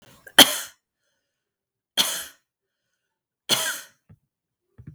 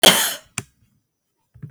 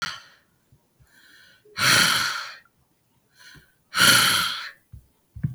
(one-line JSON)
{"three_cough_length": "4.9 s", "three_cough_amplitude": 32768, "three_cough_signal_mean_std_ratio": 0.22, "cough_length": "1.7 s", "cough_amplitude": 32768, "cough_signal_mean_std_ratio": 0.3, "exhalation_length": "5.5 s", "exhalation_amplitude": 26080, "exhalation_signal_mean_std_ratio": 0.42, "survey_phase": "beta (2021-08-13 to 2022-03-07)", "age": "45-64", "gender": "Female", "wearing_mask": "No", "symptom_none": true, "smoker_status": "Never smoked", "respiratory_condition_asthma": true, "respiratory_condition_other": false, "recruitment_source": "REACT", "submission_delay": "1 day", "covid_test_result": "Negative", "covid_test_method": "RT-qPCR", "influenza_a_test_result": "Unknown/Void", "influenza_b_test_result": "Unknown/Void"}